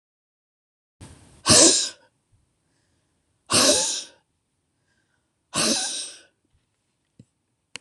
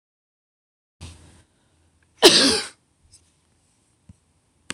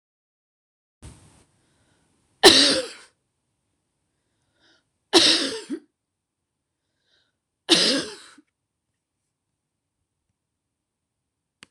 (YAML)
exhalation_length: 7.8 s
exhalation_amplitude: 25786
exhalation_signal_mean_std_ratio: 0.31
cough_length: 4.7 s
cough_amplitude: 26028
cough_signal_mean_std_ratio: 0.22
three_cough_length: 11.7 s
three_cough_amplitude: 26028
three_cough_signal_mean_std_ratio: 0.23
survey_phase: beta (2021-08-13 to 2022-03-07)
age: 65+
gender: Female
wearing_mask: 'No'
symptom_runny_or_blocked_nose: true
smoker_status: Never smoked
respiratory_condition_asthma: false
respiratory_condition_other: false
recruitment_source: REACT
submission_delay: 3 days
covid_test_result: Negative
covid_test_method: RT-qPCR
influenza_a_test_result: Negative
influenza_b_test_result: Negative